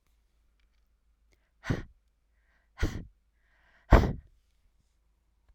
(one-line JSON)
{"exhalation_length": "5.5 s", "exhalation_amplitude": 17798, "exhalation_signal_mean_std_ratio": 0.2, "survey_phase": "alpha (2021-03-01 to 2021-08-12)", "age": "45-64", "gender": "Female", "wearing_mask": "No", "symptom_none": true, "smoker_status": "Ex-smoker", "respiratory_condition_asthma": false, "respiratory_condition_other": false, "recruitment_source": "REACT", "submission_delay": "1 day", "covid_test_result": "Negative", "covid_test_method": "RT-qPCR"}